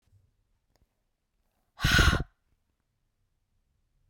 {
  "exhalation_length": "4.1 s",
  "exhalation_amplitude": 12800,
  "exhalation_signal_mean_std_ratio": 0.24,
  "survey_phase": "beta (2021-08-13 to 2022-03-07)",
  "age": "18-44",
  "gender": "Female",
  "wearing_mask": "No",
  "symptom_cough_any": true,
  "symptom_runny_or_blocked_nose": true,
  "symptom_fatigue": true,
  "symptom_onset": "3 days",
  "smoker_status": "Never smoked",
  "respiratory_condition_asthma": false,
  "respiratory_condition_other": false,
  "recruitment_source": "Test and Trace",
  "submission_delay": "1 day",
  "covid_test_result": "Negative",
  "covid_test_method": "ePCR"
}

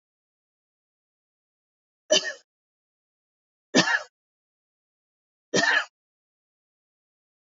{
  "three_cough_length": "7.6 s",
  "three_cough_amplitude": 18082,
  "three_cough_signal_mean_std_ratio": 0.23,
  "survey_phase": "beta (2021-08-13 to 2022-03-07)",
  "age": "45-64",
  "gender": "Female",
  "wearing_mask": "No",
  "symptom_runny_or_blocked_nose": true,
  "symptom_onset": "3 days",
  "smoker_status": "Never smoked",
  "respiratory_condition_asthma": false,
  "respiratory_condition_other": false,
  "recruitment_source": "Test and Trace",
  "submission_delay": "1 day",
  "covid_test_result": "Positive",
  "covid_test_method": "RT-qPCR",
  "covid_ct_value": 18.6,
  "covid_ct_gene": "ORF1ab gene",
  "covid_ct_mean": 18.6,
  "covid_viral_load": "770000 copies/ml",
  "covid_viral_load_category": "Low viral load (10K-1M copies/ml)"
}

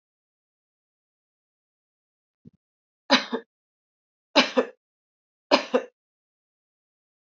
{
  "three_cough_length": "7.3 s",
  "three_cough_amplitude": 26653,
  "three_cough_signal_mean_std_ratio": 0.2,
  "survey_phase": "alpha (2021-03-01 to 2021-08-12)",
  "age": "45-64",
  "gender": "Female",
  "wearing_mask": "No",
  "symptom_fatigue": true,
  "symptom_headache": true,
  "smoker_status": "Never smoked",
  "respiratory_condition_asthma": false,
  "respiratory_condition_other": false,
  "recruitment_source": "Test and Trace",
  "submission_delay": "1 day",
  "covid_test_result": "Positive",
  "covid_test_method": "RT-qPCR",
  "covid_ct_value": 30.6,
  "covid_ct_gene": "ORF1ab gene",
  "covid_ct_mean": 31.4,
  "covid_viral_load": "52 copies/ml",
  "covid_viral_load_category": "Minimal viral load (< 10K copies/ml)"
}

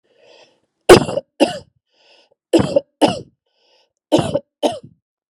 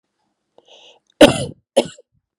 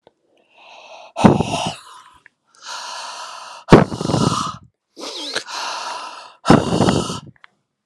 {
  "three_cough_length": "5.3 s",
  "three_cough_amplitude": 32768,
  "three_cough_signal_mean_std_ratio": 0.3,
  "cough_length": "2.4 s",
  "cough_amplitude": 32768,
  "cough_signal_mean_std_ratio": 0.23,
  "exhalation_length": "7.9 s",
  "exhalation_amplitude": 32768,
  "exhalation_signal_mean_std_ratio": 0.4,
  "survey_phase": "alpha (2021-03-01 to 2021-08-12)",
  "age": "45-64",
  "gender": "Female",
  "wearing_mask": "No",
  "symptom_none": true,
  "smoker_status": "Never smoked",
  "respiratory_condition_asthma": false,
  "respiratory_condition_other": false,
  "recruitment_source": "REACT",
  "submission_delay": "2 days",
  "covid_test_result": "Negative",
  "covid_test_method": "RT-qPCR"
}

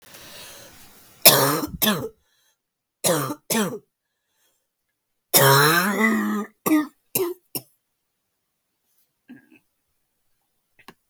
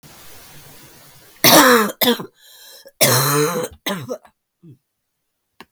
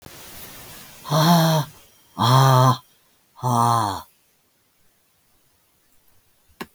{
  "three_cough_length": "11.1 s",
  "three_cough_amplitude": 32768,
  "three_cough_signal_mean_std_ratio": 0.38,
  "cough_length": "5.7 s",
  "cough_amplitude": 32768,
  "cough_signal_mean_std_ratio": 0.42,
  "exhalation_length": "6.7 s",
  "exhalation_amplitude": 25529,
  "exhalation_signal_mean_std_ratio": 0.43,
  "survey_phase": "beta (2021-08-13 to 2022-03-07)",
  "age": "65+",
  "gender": "Female",
  "wearing_mask": "No",
  "symptom_cough_any": true,
  "symptom_runny_or_blocked_nose": true,
  "symptom_shortness_of_breath": true,
  "symptom_sore_throat": true,
  "symptom_fatigue": true,
  "symptom_fever_high_temperature": true,
  "symptom_headache": true,
  "symptom_onset": "3 days",
  "smoker_status": "Ex-smoker",
  "respiratory_condition_asthma": false,
  "respiratory_condition_other": false,
  "recruitment_source": "Test and Trace",
  "submission_delay": "1 day",
  "covid_test_result": "Positive",
  "covid_test_method": "RT-qPCR",
  "covid_ct_value": 13.6,
  "covid_ct_gene": "ORF1ab gene",
  "covid_ct_mean": 14.0,
  "covid_viral_load": "25000000 copies/ml",
  "covid_viral_load_category": "High viral load (>1M copies/ml)"
}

